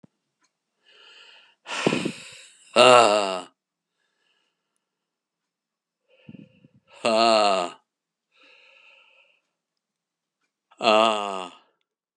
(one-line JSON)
{"exhalation_length": "12.2 s", "exhalation_amplitude": 31699, "exhalation_signal_mean_std_ratio": 0.3, "survey_phase": "beta (2021-08-13 to 2022-03-07)", "age": "65+", "gender": "Male", "wearing_mask": "No", "symptom_none": true, "smoker_status": "Ex-smoker", "respiratory_condition_asthma": false, "respiratory_condition_other": false, "recruitment_source": "REACT", "submission_delay": "2 days", "covid_test_result": "Negative", "covid_test_method": "RT-qPCR", "influenza_a_test_result": "Negative", "influenza_b_test_result": "Negative"}